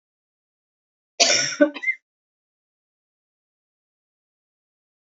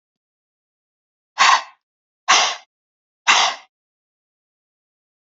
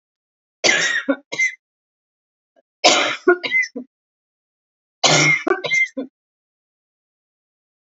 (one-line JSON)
{"cough_length": "5.0 s", "cough_amplitude": 27662, "cough_signal_mean_std_ratio": 0.24, "exhalation_length": "5.3 s", "exhalation_amplitude": 30001, "exhalation_signal_mean_std_ratio": 0.29, "three_cough_length": "7.9 s", "three_cough_amplitude": 32767, "three_cough_signal_mean_std_ratio": 0.41, "survey_phase": "beta (2021-08-13 to 2022-03-07)", "age": "45-64", "gender": "Female", "wearing_mask": "No", "symptom_cough_any": true, "symptom_runny_or_blocked_nose": true, "symptom_fever_high_temperature": true, "symptom_onset": "3 days", "smoker_status": "Never smoked", "respiratory_condition_asthma": false, "respiratory_condition_other": false, "recruitment_source": "Test and Trace", "submission_delay": "2 days", "covid_test_result": "Positive", "covid_test_method": "RT-qPCR", "covid_ct_value": 26.0, "covid_ct_gene": "N gene"}